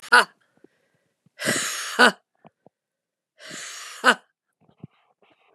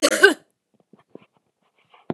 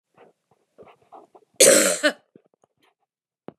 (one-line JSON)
{"exhalation_length": "5.5 s", "exhalation_amplitude": 32674, "exhalation_signal_mean_std_ratio": 0.27, "cough_length": "2.1 s", "cough_amplitude": 32767, "cough_signal_mean_std_ratio": 0.26, "three_cough_length": "3.6 s", "three_cough_amplitude": 29754, "three_cough_signal_mean_std_ratio": 0.28, "survey_phase": "beta (2021-08-13 to 2022-03-07)", "age": "65+", "gender": "Female", "wearing_mask": "No", "symptom_cough_any": true, "smoker_status": "Ex-smoker", "respiratory_condition_asthma": false, "respiratory_condition_other": false, "recruitment_source": "Test and Trace", "submission_delay": "1 day", "covid_test_result": "Negative", "covid_test_method": "RT-qPCR"}